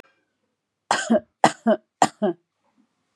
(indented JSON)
{
  "three_cough_length": "3.2 s",
  "three_cough_amplitude": 31462,
  "three_cough_signal_mean_std_ratio": 0.31,
  "survey_phase": "beta (2021-08-13 to 2022-03-07)",
  "age": "45-64",
  "gender": "Female",
  "wearing_mask": "No",
  "symptom_runny_or_blocked_nose": true,
  "symptom_fatigue": true,
  "symptom_onset": "12 days",
  "smoker_status": "Ex-smoker",
  "respiratory_condition_asthma": false,
  "respiratory_condition_other": false,
  "recruitment_source": "REACT",
  "submission_delay": "1 day",
  "covid_test_result": "Negative",
  "covid_test_method": "RT-qPCR",
  "influenza_a_test_result": "Negative",
  "influenza_b_test_result": "Negative"
}